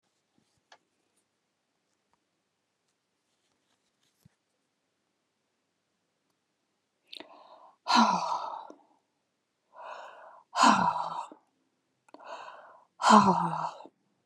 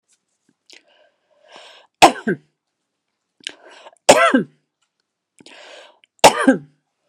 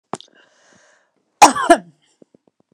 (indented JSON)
{
  "exhalation_length": "14.3 s",
  "exhalation_amplitude": 18013,
  "exhalation_signal_mean_std_ratio": 0.27,
  "three_cough_length": "7.1 s",
  "three_cough_amplitude": 32768,
  "three_cough_signal_mean_std_ratio": 0.25,
  "cough_length": "2.7 s",
  "cough_amplitude": 32768,
  "cough_signal_mean_std_ratio": 0.23,
  "survey_phase": "beta (2021-08-13 to 2022-03-07)",
  "age": "45-64",
  "gender": "Female",
  "wearing_mask": "No",
  "symptom_cough_any": true,
  "symptom_onset": "5 days",
  "smoker_status": "Ex-smoker",
  "respiratory_condition_asthma": false,
  "respiratory_condition_other": false,
  "recruitment_source": "REACT",
  "submission_delay": "2 days",
  "covid_test_result": "Negative",
  "covid_test_method": "RT-qPCR"
}